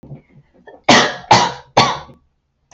{
  "three_cough_length": "2.7 s",
  "three_cough_amplitude": 32768,
  "three_cough_signal_mean_std_ratio": 0.4,
  "survey_phase": "beta (2021-08-13 to 2022-03-07)",
  "age": "18-44",
  "gender": "Female",
  "wearing_mask": "No",
  "symptom_none": true,
  "smoker_status": "Never smoked",
  "respiratory_condition_asthma": false,
  "respiratory_condition_other": false,
  "recruitment_source": "REACT",
  "submission_delay": "2 days",
  "covid_test_result": "Negative",
  "covid_test_method": "RT-qPCR",
  "influenza_a_test_result": "Negative",
  "influenza_b_test_result": "Negative"
}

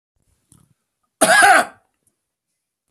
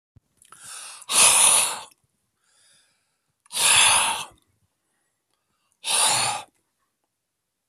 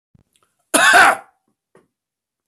{
  "three_cough_length": "2.9 s",
  "three_cough_amplitude": 32768,
  "three_cough_signal_mean_std_ratio": 0.32,
  "exhalation_length": "7.7 s",
  "exhalation_amplitude": 27636,
  "exhalation_signal_mean_std_ratio": 0.4,
  "cough_length": "2.5 s",
  "cough_amplitude": 32768,
  "cough_signal_mean_std_ratio": 0.34,
  "survey_phase": "beta (2021-08-13 to 2022-03-07)",
  "age": "65+",
  "gender": "Male",
  "wearing_mask": "No",
  "symptom_none": true,
  "symptom_onset": "12 days",
  "smoker_status": "Never smoked",
  "respiratory_condition_asthma": false,
  "respiratory_condition_other": false,
  "recruitment_source": "REACT",
  "submission_delay": "32 days",
  "covid_test_result": "Negative",
  "covid_test_method": "RT-qPCR",
  "influenza_a_test_result": "Unknown/Void",
  "influenza_b_test_result": "Unknown/Void"
}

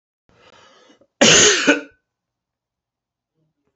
{
  "cough_length": "3.8 s",
  "cough_amplitude": 31200,
  "cough_signal_mean_std_ratio": 0.31,
  "survey_phase": "beta (2021-08-13 to 2022-03-07)",
  "age": "45-64",
  "gender": "Male",
  "wearing_mask": "No",
  "symptom_cough_any": true,
  "symptom_runny_or_blocked_nose": true,
  "symptom_sore_throat": true,
  "symptom_fatigue": true,
  "smoker_status": "Never smoked",
  "respiratory_condition_asthma": false,
  "respiratory_condition_other": false,
  "recruitment_source": "Test and Trace",
  "submission_delay": "2 days",
  "covid_test_result": "Positive",
  "covid_test_method": "ePCR"
}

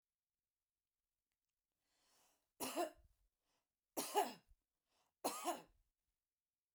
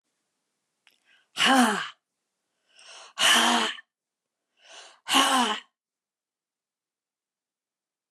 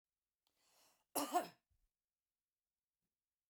{
  "three_cough_length": "6.7 s",
  "three_cough_amplitude": 2027,
  "three_cough_signal_mean_std_ratio": 0.27,
  "exhalation_length": "8.1 s",
  "exhalation_amplitude": 16093,
  "exhalation_signal_mean_std_ratio": 0.35,
  "cough_length": "3.5 s",
  "cough_amplitude": 2115,
  "cough_signal_mean_std_ratio": 0.22,
  "survey_phase": "beta (2021-08-13 to 2022-03-07)",
  "age": "65+",
  "gender": "Female",
  "wearing_mask": "No",
  "symptom_none": true,
  "smoker_status": "Never smoked",
  "respiratory_condition_asthma": false,
  "respiratory_condition_other": false,
  "recruitment_source": "REACT",
  "submission_delay": "2 days",
  "covid_test_result": "Negative",
  "covid_test_method": "RT-qPCR"
}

